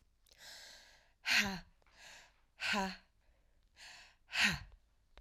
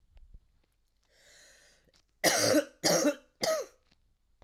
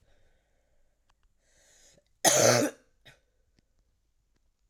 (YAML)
exhalation_length: 5.2 s
exhalation_amplitude: 5471
exhalation_signal_mean_std_ratio: 0.37
three_cough_length: 4.4 s
three_cough_amplitude: 11028
three_cough_signal_mean_std_ratio: 0.39
cough_length: 4.7 s
cough_amplitude: 14492
cough_signal_mean_std_ratio: 0.25
survey_phase: beta (2021-08-13 to 2022-03-07)
age: 18-44
gender: Female
wearing_mask: 'No'
symptom_cough_any: true
symptom_new_continuous_cough: true
symptom_fatigue: true
symptom_fever_high_temperature: true
symptom_headache: true
symptom_onset: 3 days
smoker_status: Ex-smoker
respiratory_condition_asthma: false
respiratory_condition_other: false
recruitment_source: Test and Trace
submission_delay: 2 days
covid_test_result: Positive
covid_test_method: RT-qPCR
covid_ct_value: 29.5
covid_ct_gene: ORF1ab gene